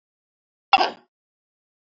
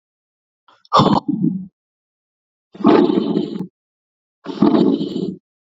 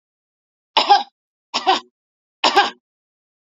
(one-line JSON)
{"cough_length": "2.0 s", "cough_amplitude": 27862, "cough_signal_mean_std_ratio": 0.19, "exhalation_length": "5.6 s", "exhalation_amplitude": 32768, "exhalation_signal_mean_std_ratio": 0.47, "three_cough_length": "3.6 s", "three_cough_amplitude": 28392, "three_cough_signal_mean_std_ratio": 0.32, "survey_phase": "beta (2021-08-13 to 2022-03-07)", "age": "45-64", "gender": "Female", "wearing_mask": "No", "symptom_none": true, "smoker_status": "Ex-smoker", "respiratory_condition_asthma": false, "respiratory_condition_other": false, "recruitment_source": "REACT", "submission_delay": "1 day", "covid_test_result": "Negative", "covid_test_method": "RT-qPCR", "influenza_a_test_result": "Negative", "influenza_b_test_result": "Negative"}